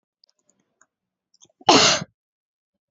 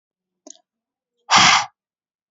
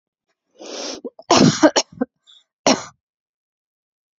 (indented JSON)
{
  "cough_length": "2.9 s",
  "cough_amplitude": 28290,
  "cough_signal_mean_std_ratio": 0.26,
  "exhalation_length": "2.3 s",
  "exhalation_amplitude": 30690,
  "exhalation_signal_mean_std_ratio": 0.31,
  "three_cough_length": "4.2 s",
  "three_cough_amplitude": 31310,
  "three_cough_signal_mean_std_ratio": 0.31,
  "survey_phase": "beta (2021-08-13 to 2022-03-07)",
  "age": "18-44",
  "gender": "Female",
  "wearing_mask": "No",
  "symptom_cough_any": true,
  "symptom_new_continuous_cough": true,
  "symptom_sore_throat": true,
  "symptom_fatigue": true,
  "symptom_onset": "12 days",
  "smoker_status": "Never smoked",
  "respiratory_condition_asthma": false,
  "respiratory_condition_other": false,
  "recruitment_source": "REACT",
  "submission_delay": "1 day",
  "covid_test_result": "Negative",
  "covid_test_method": "RT-qPCR",
  "influenza_a_test_result": "Negative",
  "influenza_b_test_result": "Negative"
}